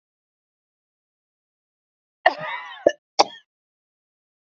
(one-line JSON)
{"cough_length": "4.5 s", "cough_amplitude": 27715, "cough_signal_mean_std_ratio": 0.17, "survey_phase": "beta (2021-08-13 to 2022-03-07)", "age": "45-64", "gender": "Female", "wearing_mask": "No", "symptom_none": true, "symptom_onset": "12 days", "smoker_status": "Never smoked", "respiratory_condition_asthma": true, "respiratory_condition_other": false, "recruitment_source": "REACT", "submission_delay": "1 day", "covid_test_result": "Negative", "covid_test_method": "RT-qPCR", "influenza_a_test_result": "Unknown/Void", "influenza_b_test_result": "Unknown/Void"}